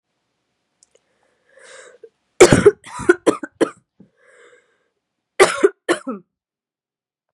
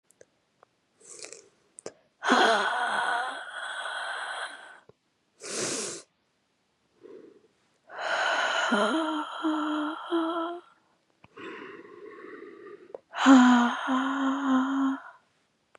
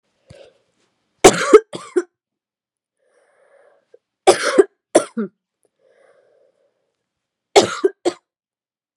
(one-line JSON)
{"cough_length": "7.3 s", "cough_amplitude": 32768, "cough_signal_mean_std_ratio": 0.25, "exhalation_length": "15.8 s", "exhalation_amplitude": 16832, "exhalation_signal_mean_std_ratio": 0.52, "three_cough_length": "9.0 s", "three_cough_amplitude": 32768, "three_cough_signal_mean_std_ratio": 0.24, "survey_phase": "beta (2021-08-13 to 2022-03-07)", "age": "18-44", "gender": "Female", "wearing_mask": "Yes", "symptom_cough_any": true, "symptom_runny_or_blocked_nose": true, "symptom_fatigue": true, "symptom_fever_high_temperature": true, "symptom_headache": true, "smoker_status": "Never smoked", "respiratory_condition_asthma": false, "respiratory_condition_other": false, "recruitment_source": "Test and Trace", "submission_delay": "3 days", "covid_test_result": "Positive", "covid_test_method": "LFT"}